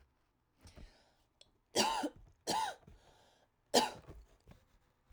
three_cough_length: 5.1 s
three_cough_amplitude: 6290
three_cough_signal_mean_std_ratio: 0.33
survey_phase: alpha (2021-03-01 to 2021-08-12)
age: 18-44
gender: Female
wearing_mask: 'No'
symptom_cough_any: true
symptom_fatigue: true
symptom_headache: true
smoker_status: Never smoked
respiratory_condition_asthma: false
respiratory_condition_other: false
recruitment_source: Test and Trace
submission_delay: 1 day
covid_test_result: Positive
covid_test_method: RT-qPCR
covid_ct_value: 17.3
covid_ct_gene: ORF1ab gene
covid_ct_mean: 18.6
covid_viral_load: 800000 copies/ml
covid_viral_load_category: Low viral load (10K-1M copies/ml)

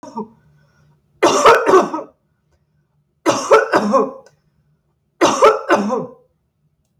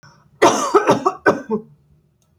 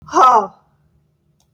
three_cough_length: 7.0 s
three_cough_amplitude: 32768
three_cough_signal_mean_std_ratio: 0.44
cough_length: 2.4 s
cough_amplitude: 28673
cough_signal_mean_std_ratio: 0.46
exhalation_length: 1.5 s
exhalation_amplitude: 29343
exhalation_signal_mean_std_ratio: 0.38
survey_phase: alpha (2021-03-01 to 2021-08-12)
age: 65+
gender: Female
wearing_mask: 'No'
symptom_none: true
smoker_status: Never smoked
respiratory_condition_asthma: false
respiratory_condition_other: false
recruitment_source: REACT
submission_delay: 1 day
covid_test_result: Negative
covid_test_method: RT-qPCR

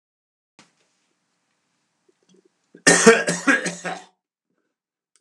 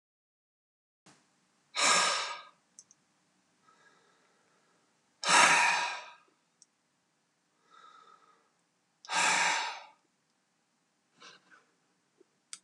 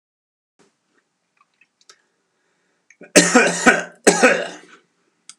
cough_length: 5.2 s
cough_amplitude: 32768
cough_signal_mean_std_ratio: 0.27
exhalation_length: 12.6 s
exhalation_amplitude: 13917
exhalation_signal_mean_std_ratio: 0.31
three_cough_length: 5.4 s
three_cough_amplitude: 32768
three_cough_signal_mean_std_ratio: 0.31
survey_phase: beta (2021-08-13 to 2022-03-07)
age: 65+
gender: Male
wearing_mask: 'No'
symptom_none: true
smoker_status: Ex-smoker
respiratory_condition_asthma: false
respiratory_condition_other: false
recruitment_source: REACT
submission_delay: 3 days
covid_test_result: Negative
covid_test_method: RT-qPCR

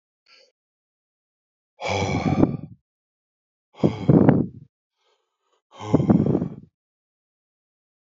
exhalation_length: 8.2 s
exhalation_amplitude: 26672
exhalation_signal_mean_std_ratio: 0.34
survey_phase: alpha (2021-03-01 to 2021-08-12)
age: 45-64
gender: Male
wearing_mask: 'No'
symptom_none: true
smoker_status: Ex-smoker
respiratory_condition_asthma: false
respiratory_condition_other: false
recruitment_source: REACT
submission_delay: 2 days
covid_test_result: Negative
covid_test_method: RT-qPCR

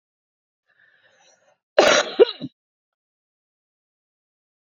cough_length: 4.6 s
cough_amplitude: 28208
cough_signal_mean_std_ratio: 0.22
survey_phase: beta (2021-08-13 to 2022-03-07)
age: 45-64
gender: Female
wearing_mask: 'No'
symptom_none: true
smoker_status: Current smoker (11 or more cigarettes per day)
respiratory_condition_asthma: true
respiratory_condition_other: false
recruitment_source: REACT
submission_delay: 5 days
covid_test_result: Negative
covid_test_method: RT-qPCR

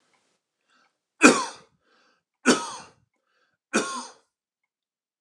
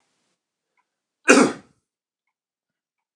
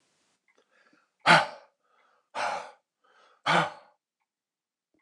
three_cough_length: 5.2 s
three_cough_amplitude: 29204
three_cough_signal_mean_std_ratio: 0.24
cough_length: 3.2 s
cough_amplitude: 29204
cough_signal_mean_std_ratio: 0.21
exhalation_length: 5.0 s
exhalation_amplitude: 21183
exhalation_signal_mean_std_ratio: 0.26
survey_phase: beta (2021-08-13 to 2022-03-07)
age: 45-64
gender: Male
wearing_mask: 'No'
symptom_none: true
smoker_status: Never smoked
respiratory_condition_asthma: false
respiratory_condition_other: false
recruitment_source: REACT
submission_delay: 2 days
covid_test_result: Negative
covid_test_method: RT-qPCR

